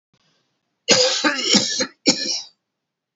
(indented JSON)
{
  "three_cough_length": "3.2 s",
  "three_cough_amplitude": 31274,
  "three_cough_signal_mean_std_ratio": 0.49,
  "survey_phase": "beta (2021-08-13 to 2022-03-07)",
  "age": "65+",
  "gender": "Male",
  "wearing_mask": "No",
  "symptom_none": true,
  "smoker_status": "Never smoked",
  "respiratory_condition_asthma": false,
  "respiratory_condition_other": false,
  "recruitment_source": "REACT",
  "submission_delay": "3 days",
  "covid_test_result": "Negative",
  "covid_test_method": "RT-qPCR",
  "influenza_a_test_result": "Negative",
  "influenza_b_test_result": "Negative"
}